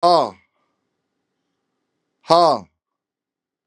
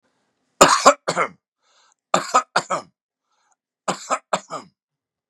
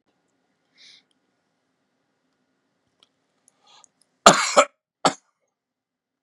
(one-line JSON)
{"exhalation_length": "3.7 s", "exhalation_amplitude": 32767, "exhalation_signal_mean_std_ratio": 0.29, "three_cough_length": "5.3 s", "three_cough_amplitude": 32768, "three_cough_signal_mean_std_ratio": 0.3, "cough_length": "6.2 s", "cough_amplitude": 32768, "cough_signal_mean_std_ratio": 0.17, "survey_phase": "beta (2021-08-13 to 2022-03-07)", "age": "65+", "gender": "Male", "wearing_mask": "No", "symptom_cough_any": true, "symptom_runny_or_blocked_nose": true, "symptom_sore_throat": true, "smoker_status": "Never smoked", "respiratory_condition_asthma": false, "respiratory_condition_other": false, "recruitment_source": "Test and Trace", "submission_delay": "1 day", "covid_test_result": "Positive", "covid_test_method": "LFT"}